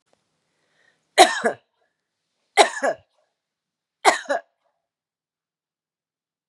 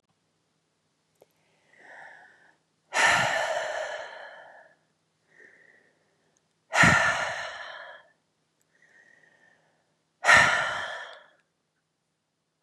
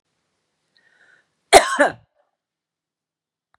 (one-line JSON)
{"three_cough_length": "6.5 s", "three_cough_amplitude": 32767, "three_cough_signal_mean_std_ratio": 0.23, "exhalation_length": "12.6 s", "exhalation_amplitude": 19164, "exhalation_signal_mean_std_ratio": 0.33, "cough_length": "3.6 s", "cough_amplitude": 32768, "cough_signal_mean_std_ratio": 0.2, "survey_phase": "beta (2021-08-13 to 2022-03-07)", "age": "45-64", "gender": "Female", "wearing_mask": "No", "symptom_none": true, "smoker_status": "Never smoked", "respiratory_condition_asthma": false, "respiratory_condition_other": false, "recruitment_source": "REACT", "submission_delay": "2 days", "covid_test_result": "Negative", "covid_test_method": "RT-qPCR", "influenza_a_test_result": "Negative", "influenza_b_test_result": "Negative"}